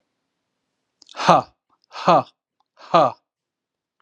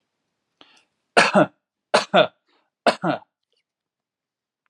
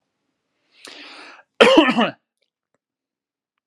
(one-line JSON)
{"exhalation_length": "4.0 s", "exhalation_amplitude": 32750, "exhalation_signal_mean_std_ratio": 0.28, "three_cough_length": "4.7 s", "three_cough_amplitude": 30637, "three_cough_signal_mean_std_ratio": 0.28, "cough_length": "3.7 s", "cough_amplitude": 32768, "cough_signal_mean_std_ratio": 0.28, "survey_phase": "alpha (2021-03-01 to 2021-08-12)", "age": "18-44", "gender": "Male", "wearing_mask": "No", "symptom_headache": true, "symptom_onset": "6 days", "smoker_status": "Never smoked", "respiratory_condition_asthma": false, "respiratory_condition_other": false, "recruitment_source": "REACT", "submission_delay": "1 day", "covid_test_result": "Negative", "covid_test_method": "RT-qPCR"}